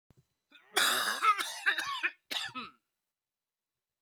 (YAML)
cough_length: 4.0 s
cough_amplitude: 9300
cough_signal_mean_std_ratio: 0.46
survey_phase: beta (2021-08-13 to 2022-03-07)
age: 45-64
gender: Male
wearing_mask: 'No'
symptom_cough_any: true
symptom_runny_or_blocked_nose: true
symptom_sore_throat: true
symptom_headache: true
symptom_onset: 6 days
smoker_status: Never smoked
respiratory_condition_asthma: false
respiratory_condition_other: false
recruitment_source: Test and Trace
submission_delay: 1 day
covid_test_result: Positive
covid_test_method: RT-qPCR
covid_ct_value: 14.6
covid_ct_gene: ORF1ab gene